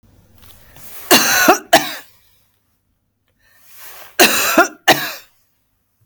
cough_length: 6.1 s
cough_amplitude: 32768
cough_signal_mean_std_ratio: 0.38
survey_phase: beta (2021-08-13 to 2022-03-07)
age: 45-64
gender: Female
wearing_mask: 'No'
symptom_none: true
smoker_status: Never smoked
respiratory_condition_asthma: false
respiratory_condition_other: false
recruitment_source: Test and Trace
submission_delay: 1 day
covid_test_result: Negative
covid_test_method: LFT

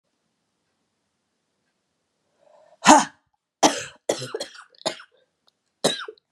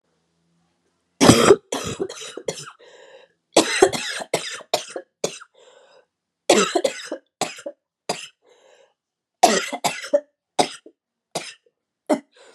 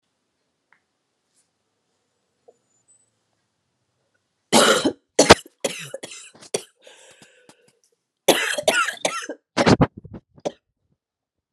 exhalation_length: 6.3 s
exhalation_amplitude: 32767
exhalation_signal_mean_std_ratio: 0.23
cough_length: 12.5 s
cough_amplitude: 32768
cough_signal_mean_std_ratio: 0.33
three_cough_length: 11.5 s
three_cough_amplitude: 32768
three_cough_signal_mean_std_ratio: 0.27
survey_phase: beta (2021-08-13 to 2022-03-07)
age: 45-64
gender: Female
wearing_mask: 'No'
symptom_cough_any: true
symptom_new_continuous_cough: true
symptom_runny_or_blocked_nose: true
symptom_shortness_of_breath: true
symptom_sore_throat: true
symptom_fatigue: true
symptom_headache: true
symptom_change_to_sense_of_smell_or_taste: true
symptom_onset: 3 days
smoker_status: Ex-smoker
respiratory_condition_asthma: false
respiratory_condition_other: false
recruitment_source: Test and Trace
submission_delay: 1 day
covid_test_result: Positive
covid_test_method: RT-qPCR
covid_ct_value: 24.6
covid_ct_gene: ORF1ab gene
covid_ct_mean: 25.0
covid_viral_load: 6500 copies/ml
covid_viral_load_category: Minimal viral load (< 10K copies/ml)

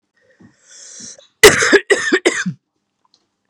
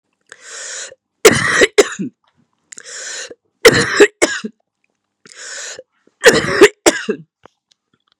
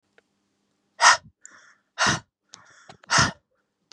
cough_length: 3.5 s
cough_amplitude: 32768
cough_signal_mean_std_ratio: 0.35
three_cough_length: 8.2 s
three_cough_amplitude: 32768
three_cough_signal_mean_std_ratio: 0.36
exhalation_length: 3.9 s
exhalation_amplitude: 28306
exhalation_signal_mean_std_ratio: 0.29
survey_phase: beta (2021-08-13 to 2022-03-07)
age: 18-44
gender: Female
wearing_mask: 'No'
symptom_cough_any: true
symptom_new_continuous_cough: true
symptom_runny_or_blocked_nose: true
symptom_sore_throat: true
symptom_diarrhoea: true
symptom_headache: true
symptom_change_to_sense_of_smell_or_taste: true
symptom_loss_of_taste: true
symptom_onset: 4 days
smoker_status: Never smoked
respiratory_condition_asthma: false
respiratory_condition_other: false
recruitment_source: Test and Trace
submission_delay: 2 days
covid_test_result: Positive
covid_test_method: RT-qPCR
covid_ct_value: 20.4
covid_ct_gene: N gene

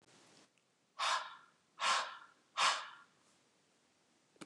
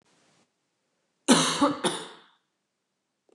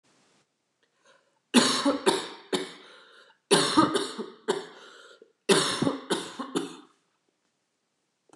exhalation_length: 4.5 s
exhalation_amplitude: 3138
exhalation_signal_mean_std_ratio: 0.37
cough_length: 3.3 s
cough_amplitude: 20591
cough_signal_mean_std_ratio: 0.32
three_cough_length: 8.4 s
three_cough_amplitude: 17924
three_cough_signal_mean_std_ratio: 0.41
survey_phase: beta (2021-08-13 to 2022-03-07)
age: 45-64
gender: Female
wearing_mask: 'No'
symptom_cough_any: true
symptom_runny_or_blocked_nose: true
symptom_sore_throat: true
symptom_headache: true
symptom_onset: 4 days
smoker_status: Never smoked
respiratory_condition_asthma: false
respiratory_condition_other: false
recruitment_source: Test and Trace
submission_delay: 2 days
covid_test_result: Negative
covid_test_method: RT-qPCR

